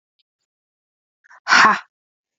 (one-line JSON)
{"exhalation_length": "2.4 s", "exhalation_amplitude": 32767, "exhalation_signal_mean_std_ratio": 0.28, "survey_phase": "beta (2021-08-13 to 2022-03-07)", "age": "18-44", "gender": "Female", "wearing_mask": "No", "symptom_cough_any": true, "symptom_runny_or_blocked_nose": true, "symptom_sore_throat": true, "symptom_fatigue": true, "symptom_headache": true, "symptom_onset": "2 days", "smoker_status": "Ex-smoker", "respiratory_condition_asthma": true, "respiratory_condition_other": false, "recruitment_source": "Test and Trace", "submission_delay": "1 day", "covid_test_result": "Positive", "covid_test_method": "RT-qPCR", "covid_ct_value": 21.7, "covid_ct_gene": "ORF1ab gene"}